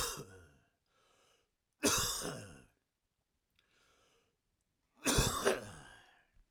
{"three_cough_length": "6.5 s", "three_cough_amplitude": 5512, "three_cough_signal_mean_std_ratio": 0.36, "survey_phase": "alpha (2021-03-01 to 2021-08-12)", "age": "18-44", "gender": "Male", "wearing_mask": "No", "symptom_none": true, "smoker_status": "Ex-smoker", "respiratory_condition_asthma": false, "respiratory_condition_other": false, "recruitment_source": "REACT", "submission_delay": "1 day", "covid_test_result": "Negative", "covid_test_method": "RT-qPCR"}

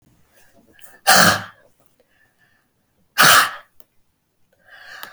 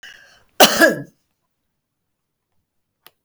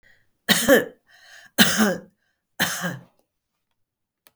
{"exhalation_length": "5.1 s", "exhalation_amplitude": 32768, "exhalation_signal_mean_std_ratio": 0.3, "cough_length": "3.2 s", "cough_amplitude": 32768, "cough_signal_mean_std_ratio": 0.24, "three_cough_length": "4.4 s", "three_cough_amplitude": 32768, "three_cough_signal_mean_std_ratio": 0.36, "survey_phase": "beta (2021-08-13 to 2022-03-07)", "age": "65+", "gender": "Female", "wearing_mask": "No", "symptom_none": true, "smoker_status": "Never smoked", "respiratory_condition_asthma": false, "respiratory_condition_other": false, "recruitment_source": "REACT", "submission_delay": "1 day", "covid_test_result": "Negative", "covid_test_method": "RT-qPCR", "influenza_a_test_result": "Negative", "influenza_b_test_result": "Negative"}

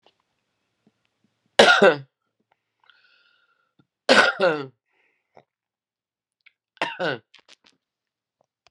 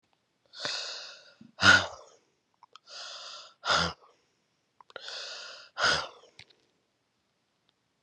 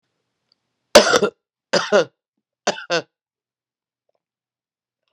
{"three_cough_length": "8.7 s", "three_cough_amplitude": 32598, "three_cough_signal_mean_std_ratio": 0.25, "exhalation_length": "8.0 s", "exhalation_amplitude": 15583, "exhalation_signal_mean_std_ratio": 0.3, "cough_length": "5.1 s", "cough_amplitude": 32768, "cough_signal_mean_std_ratio": 0.26, "survey_phase": "beta (2021-08-13 to 2022-03-07)", "age": "45-64", "gender": "Female", "wearing_mask": "No", "symptom_cough_any": true, "symptom_runny_or_blocked_nose": true, "symptom_sore_throat": true, "symptom_fatigue": true, "symptom_headache": true, "smoker_status": "Current smoker (e-cigarettes or vapes only)", "respiratory_condition_asthma": false, "respiratory_condition_other": false, "recruitment_source": "Test and Trace", "submission_delay": "1 day", "covid_test_result": "Positive", "covid_test_method": "RT-qPCR", "covid_ct_value": 19.1, "covid_ct_gene": "ORF1ab gene", "covid_ct_mean": 19.9, "covid_viral_load": "290000 copies/ml", "covid_viral_load_category": "Low viral load (10K-1M copies/ml)"}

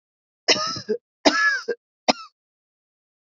{"three_cough_length": "3.2 s", "three_cough_amplitude": 29391, "three_cough_signal_mean_std_ratio": 0.38, "survey_phase": "beta (2021-08-13 to 2022-03-07)", "age": "45-64", "gender": "Female", "wearing_mask": "No", "symptom_cough_any": true, "symptom_runny_or_blocked_nose": true, "symptom_sore_throat": true, "symptom_fatigue": true, "symptom_fever_high_temperature": true, "symptom_headache": true, "symptom_change_to_sense_of_smell_or_taste": true, "symptom_onset": "4 days", "smoker_status": "Never smoked", "respiratory_condition_asthma": false, "respiratory_condition_other": false, "recruitment_source": "Test and Trace", "submission_delay": "2 days", "covid_test_result": "Positive", "covid_test_method": "RT-qPCR", "covid_ct_value": 17.4, "covid_ct_gene": "ORF1ab gene", "covid_ct_mean": 17.7, "covid_viral_load": "1500000 copies/ml", "covid_viral_load_category": "High viral load (>1M copies/ml)"}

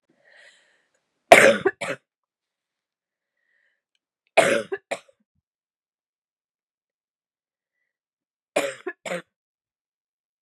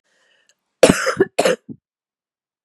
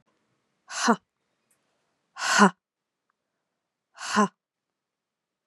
{"three_cough_length": "10.4 s", "three_cough_amplitude": 32768, "three_cough_signal_mean_std_ratio": 0.2, "cough_length": "2.6 s", "cough_amplitude": 32768, "cough_signal_mean_std_ratio": 0.3, "exhalation_length": "5.5 s", "exhalation_amplitude": 23693, "exhalation_signal_mean_std_ratio": 0.25, "survey_phase": "beta (2021-08-13 to 2022-03-07)", "age": "18-44", "gender": "Female", "wearing_mask": "No", "symptom_cough_any": true, "symptom_runny_or_blocked_nose": true, "symptom_fatigue": true, "symptom_change_to_sense_of_smell_or_taste": true, "symptom_loss_of_taste": true, "symptom_other": true, "smoker_status": "Never smoked", "respiratory_condition_asthma": false, "respiratory_condition_other": false, "recruitment_source": "Test and Trace", "submission_delay": "2 days", "covid_test_result": "Positive", "covid_test_method": "RT-qPCR", "covid_ct_value": 15.4, "covid_ct_gene": "ORF1ab gene", "covid_ct_mean": 15.8, "covid_viral_load": "6700000 copies/ml", "covid_viral_load_category": "High viral load (>1M copies/ml)"}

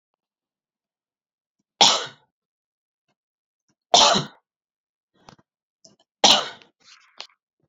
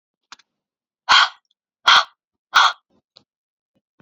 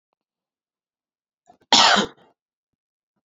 {"three_cough_length": "7.7 s", "three_cough_amplitude": 32412, "three_cough_signal_mean_std_ratio": 0.23, "exhalation_length": "4.0 s", "exhalation_amplitude": 29635, "exhalation_signal_mean_std_ratio": 0.29, "cough_length": "3.2 s", "cough_amplitude": 30890, "cough_signal_mean_std_ratio": 0.25, "survey_phase": "alpha (2021-03-01 to 2021-08-12)", "age": "18-44", "gender": "Female", "wearing_mask": "No", "symptom_none": true, "symptom_onset": "3 days", "smoker_status": "Current smoker (1 to 10 cigarettes per day)", "respiratory_condition_asthma": false, "respiratory_condition_other": false, "recruitment_source": "Test and Trace", "submission_delay": "2 days", "covid_test_result": "Positive", "covid_test_method": "RT-qPCR", "covid_ct_value": 15.1, "covid_ct_gene": "ORF1ab gene", "covid_ct_mean": 15.3, "covid_viral_load": "9400000 copies/ml", "covid_viral_load_category": "High viral load (>1M copies/ml)"}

